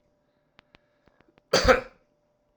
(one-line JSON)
{"cough_length": "2.6 s", "cough_amplitude": 17561, "cough_signal_mean_std_ratio": 0.25, "survey_phase": "alpha (2021-03-01 to 2021-08-12)", "age": "45-64", "gender": "Male", "wearing_mask": "No", "symptom_none": true, "smoker_status": "Current smoker (1 to 10 cigarettes per day)", "respiratory_condition_asthma": false, "respiratory_condition_other": false, "recruitment_source": "REACT", "submission_delay": "1 day", "covid_test_result": "Negative", "covid_test_method": "RT-qPCR"}